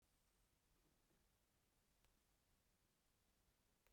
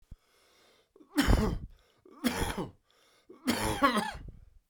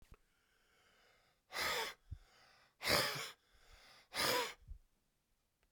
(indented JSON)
{
  "cough_length": "3.9 s",
  "cough_amplitude": 45,
  "cough_signal_mean_std_ratio": 1.0,
  "three_cough_length": "4.7 s",
  "three_cough_amplitude": 12014,
  "three_cough_signal_mean_std_ratio": 0.45,
  "exhalation_length": "5.7 s",
  "exhalation_amplitude": 5535,
  "exhalation_signal_mean_std_ratio": 0.4,
  "survey_phase": "beta (2021-08-13 to 2022-03-07)",
  "age": "45-64",
  "gender": "Male",
  "wearing_mask": "No",
  "symptom_cough_any": true,
  "symptom_runny_or_blocked_nose": true,
  "symptom_sore_throat": true,
  "symptom_fever_high_temperature": true,
  "symptom_change_to_sense_of_smell_or_taste": true,
  "symptom_onset": "3 days",
  "smoker_status": "Never smoked",
  "respiratory_condition_asthma": true,
  "respiratory_condition_other": false,
  "recruitment_source": "Test and Trace",
  "submission_delay": "2 days",
  "covid_test_result": "Positive",
  "covid_test_method": "ePCR"
}